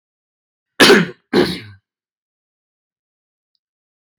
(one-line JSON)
{"cough_length": "4.2 s", "cough_amplitude": 32768, "cough_signal_mean_std_ratio": 0.26, "survey_phase": "beta (2021-08-13 to 2022-03-07)", "age": "18-44", "gender": "Male", "wearing_mask": "No", "symptom_none": true, "smoker_status": "Never smoked", "respiratory_condition_asthma": false, "respiratory_condition_other": false, "recruitment_source": "REACT", "submission_delay": "1 day", "covid_test_result": "Negative", "covid_test_method": "RT-qPCR"}